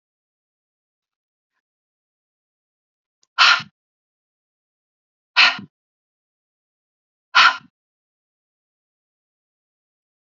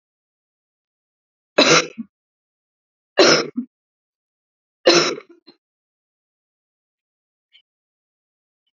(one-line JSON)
{"exhalation_length": "10.3 s", "exhalation_amplitude": 30583, "exhalation_signal_mean_std_ratio": 0.18, "three_cough_length": "8.8 s", "three_cough_amplitude": 32622, "three_cough_signal_mean_std_ratio": 0.24, "survey_phase": "alpha (2021-03-01 to 2021-08-12)", "age": "45-64", "gender": "Female", "wearing_mask": "No", "symptom_cough_any": true, "symptom_fatigue": true, "symptom_headache": true, "symptom_change_to_sense_of_smell_or_taste": true, "symptom_loss_of_taste": true, "symptom_onset": "7 days", "smoker_status": "Ex-smoker", "respiratory_condition_asthma": false, "respiratory_condition_other": false, "recruitment_source": "Test and Trace", "submission_delay": "2 days", "covid_test_result": "Positive", "covid_test_method": "RT-qPCR"}